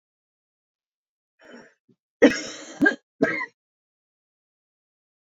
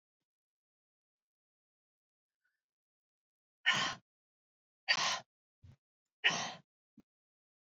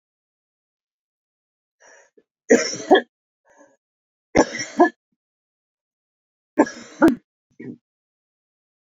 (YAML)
cough_length: 5.3 s
cough_amplitude: 26413
cough_signal_mean_std_ratio: 0.23
exhalation_length: 7.8 s
exhalation_amplitude: 5663
exhalation_signal_mean_std_ratio: 0.24
three_cough_length: 8.9 s
three_cough_amplitude: 27735
three_cough_signal_mean_std_ratio: 0.23
survey_phase: beta (2021-08-13 to 2022-03-07)
age: 45-64
gender: Female
wearing_mask: 'No'
symptom_cough_any: true
symptom_runny_or_blocked_nose: true
symptom_headache: true
symptom_other: true
symptom_onset: 4 days
smoker_status: Ex-smoker
respiratory_condition_asthma: false
respiratory_condition_other: false
recruitment_source: Test and Trace
submission_delay: 1 day
covid_test_result: Positive
covid_test_method: RT-qPCR